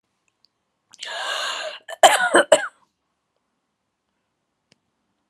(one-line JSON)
{"cough_length": "5.3 s", "cough_amplitude": 32768, "cough_signal_mean_std_ratio": 0.28, "survey_phase": "alpha (2021-03-01 to 2021-08-12)", "age": "45-64", "gender": "Female", "wearing_mask": "No", "symptom_none": true, "smoker_status": "Never smoked", "respiratory_condition_asthma": false, "respiratory_condition_other": true, "recruitment_source": "REACT", "submission_delay": "1 day", "covid_test_result": "Negative", "covid_test_method": "RT-qPCR"}